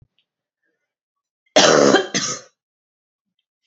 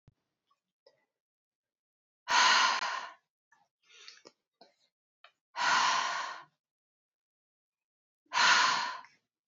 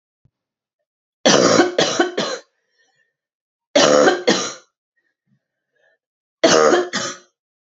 {"cough_length": "3.7 s", "cough_amplitude": 32146, "cough_signal_mean_std_ratio": 0.32, "exhalation_length": "9.5 s", "exhalation_amplitude": 9133, "exhalation_signal_mean_std_ratio": 0.37, "three_cough_length": "7.8 s", "three_cough_amplitude": 32609, "three_cough_signal_mean_std_ratio": 0.42, "survey_phase": "beta (2021-08-13 to 2022-03-07)", "age": "18-44", "gender": "Female", "wearing_mask": "No", "symptom_cough_any": true, "symptom_runny_or_blocked_nose": true, "symptom_change_to_sense_of_smell_or_taste": true, "symptom_loss_of_taste": true, "symptom_other": true, "symptom_onset": "4 days", "smoker_status": "Never smoked", "respiratory_condition_asthma": false, "respiratory_condition_other": false, "recruitment_source": "Test and Trace", "submission_delay": "1 day", "covid_test_result": "Positive", "covid_test_method": "ePCR"}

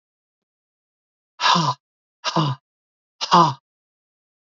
{"exhalation_length": "4.4 s", "exhalation_amplitude": 27973, "exhalation_signal_mean_std_ratio": 0.33, "survey_phase": "beta (2021-08-13 to 2022-03-07)", "age": "45-64", "gender": "Male", "wearing_mask": "No", "symptom_cough_any": true, "symptom_new_continuous_cough": true, "symptom_runny_or_blocked_nose": true, "symptom_headache": true, "symptom_onset": "3 days", "smoker_status": "Never smoked", "respiratory_condition_asthma": true, "respiratory_condition_other": false, "recruitment_source": "Test and Trace", "submission_delay": "1 day", "covid_test_result": "Positive", "covid_test_method": "RT-qPCR", "covid_ct_value": 25.0, "covid_ct_gene": "ORF1ab gene", "covid_ct_mean": 25.3, "covid_viral_load": "5100 copies/ml", "covid_viral_load_category": "Minimal viral load (< 10K copies/ml)"}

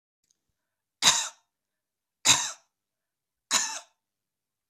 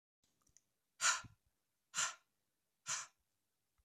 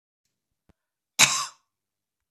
{"three_cough_length": "4.7 s", "three_cough_amplitude": 19305, "three_cough_signal_mean_std_ratio": 0.27, "exhalation_length": "3.8 s", "exhalation_amplitude": 2945, "exhalation_signal_mean_std_ratio": 0.28, "cough_length": "2.3 s", "cough_amplitude": 26918, "cough_signal_mean_std_ratio": 0.22, "survey_phase": "beta (2021-08-13 to 2022-03-07)", "age": "65+", "gender": "Female", "wearing_mask": "No", "symptom_fatigue": true, "smoker_status": "Never smoked", "respiratory_condition_asthma": false, "respiratory_condition_other": false, "recruitment_source": "Test and Trace", "submission_delay": "0 days", "covid_test_result": "Negative", "covid_test_method": "LFT"}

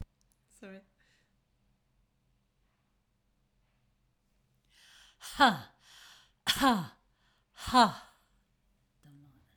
{"exhalation_length": "9.6 s", "exhalation_amplitude": 9442, "exhalation_signal_mean_std_ratio": 0.23, "survey_phase": "alpha (2021-03-01 to 2021-08-12)", "age": "65+", "gender": "Female", "wearing_mask": "No", "symptom_none": true, "smoker_status": "Never smoked", "respiratory_condition_asthma": false, "respiratory_condition_other": false, "recruitment_source": "REACT", "submission_delay": "4 days", "covid_test_result": "Negative", "covid_test_method": "RT-qPCR", "covid_ct_value": 45.0, "covid_ct_gene": "N gene"}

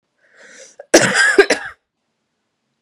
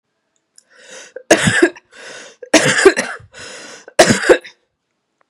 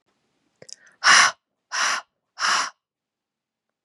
{"cough_length": "2.8 s", "cough_amplitude": 32768, "cough_signal_mean_std_ratio": 0.35, "three_cough_length": "5.3 s", "three_cough_amplitude": 32768, "three_cough_signal_mean_std_ratio": 0.38, "exhalation_length": "3.8 s", "exhalation_amplitude": 27339, "exhalation_signal_mean_std_ratio": 0.34, "survey_phase": "beta (2021-08-13 to 2022-03-07)", "age": "18-44", "gender": "Female", "wearing_mask": "No", "symptom_new_continuous_cough": true, "symptom_runny_or_blocked_nose": true, "symptom_shortness_of_breath": true, "symptom_change_to_sense_of_smell_or_taste": true, "symptom_loss_of_taste": true, "symptom_other": true, "symptom_onset": "4 days", "smoker_status": "Never smoked", "respiratory_condition_asthma": false, "respiratory_condition_other": false, "recruitment_source": "Test and Trace", "submission_delay": "2 days", "covid_test_result": "Positive", "covid_test_method": "LAMP"}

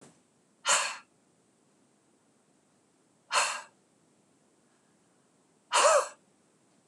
{"exhalation_length": "6.9 s", "exhalation_amplitude": 9661, "exhalation_signal_mean_std_ratio": 0.28, "survey_phase": "beta (2021-08-13 to 2022-03-07)", "age": "65+", "gender": "Female", "wearing_mask": "No", "symptom_none": true, "smoker_status": "Never smoked", "respiratory_condition_asthma": false, "respiratory_condition_other": false, "recruitment_source": "REACT", "submission_delay": "2 days", "covid_test_result": "Negative", "covid_test_method": "RT-qPCR", "influenza_a_test_result": "Negative", "influenza_b_test_result": "Negative"}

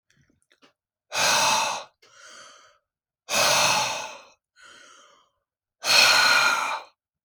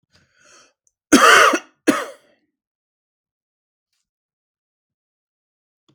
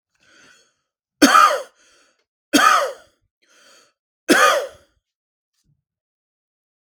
{"exhalation_length": "7.2 s", "exhalation_amplitude": 23669, "exhalation_signal_mean_std_ratio": 0.48, "cough_length": "5.9 s", "cough_amplitude": 32768, "cough_signal_mean_std_ratio": 0.24, "three_cough_length": "7.0 s", "three_cough_amplitude": 32768, "three_cough_signal_mean_std_ratio": 0.31, "survey_phase": "beta (2021-08-13 to 2022-03-07)", "age": "18-44", "gender": "Male", "wearing_mask": "No", "symptom_none": true, "smoker_status": "Never smoked", "respiratory_condition_asthma": true, "respiratory_condition_other": false, "recruitment_source": "REACT", "submission_delay": "1 day", "covid_test_result": "Negative", "covid_test_method": "RT-qPCR", "influenza_a_test_result": "Unknown/Void", "influenza_b_test_result": "Unknown/Void"}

